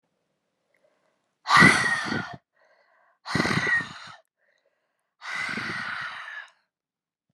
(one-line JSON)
{"exhalation_length": "7.3 s", "exhalation_amplitude": 25766, "exhalation_signal_mean_std_ratio": 0.37, "survey_phase": "beta (2021-08-13 to 2022-03-07)", "age": "18-44", "gender": "Female", "wearing_mask": "No", "symptom_cough_any": true, "symptom_runny_or_blocked_nose": true, "symptom_headache": true, "symptom_onset": "4 days", "smoker_status": "Ex-smoker", "respiratory_condition_asthma": false, "respiratory_condition_other": false, "recruitment_source": "Test and Trace", "submission_delay": "2 days", "covid_test_result": "Positive", "covid_test_method": "RT-qPCR", "covid_ct_value": 15.1, "covid_ct_gene": "ORF1ab gene"}